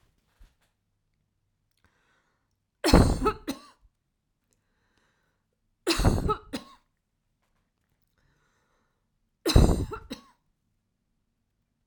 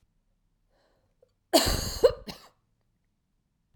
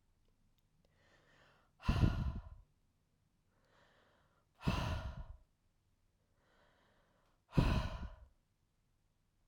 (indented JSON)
{
  "three_cough_length": "11.9 s",
  "three_cough_amplitude": 25186,
  "three_cough_signal_mean_std_ratio": 0.25,
  "cough_length": "3.8 s",
  "cough_amplitude": 15140,
  "cough_signal_mean_std_ratio": 0.26,
  "exhalation_length": "9.5 s",
  "exhalation_amplitude": 3997,
  "exhalation_signal_mean_std_ratio": 0.31,
  "survey_phase": "beta (2021-08-13 to 2022-03-07)",
  "age": "45-64",
  "gender": "Female",
  "wearing_mask": "No",
  "symptom_runny_or_blocked_nose": true,
  "symptom_shortness_of_breath": true,
  "symptom_onset": "7 days",
  "smoker_status": "Ex-smoker",
  "respiratory_condition_asthma": false,
  "respiratory_condition_other": false,
  "recruitment_source": "REACT",
  "submission_delay": "0 days",
  "covid_test_result": "Negative",
  "covid_test_method": "RT-qPCR"
}